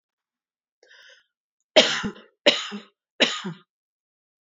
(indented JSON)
{
  "three_cough_length": "4.4 s",
  "three_cough_amplitude": 28656,
  "three_cough_signal_mean_std_ratio": 0.27,
  "survey_phase": "beta (2021-08-13 to 2022-03-07)",
  "age": "18-44",
  "gender": "Female",
  "wearing_mask": "No",
  "symptom_none": true,
  "smoker_status": "Never smoked",
  "respiratory_condition_asthma": false,
  "respiratory_condition_other": false,
  "recruitment_source": "REACT",
  "submission_delay": "1 day",
  "covid_test_result": "Negative",
  "covid_test_method": "RT-qPCR",
  "influenza_a_test_result": "Negative",
  "influenza_b_test_result": "Negative"
}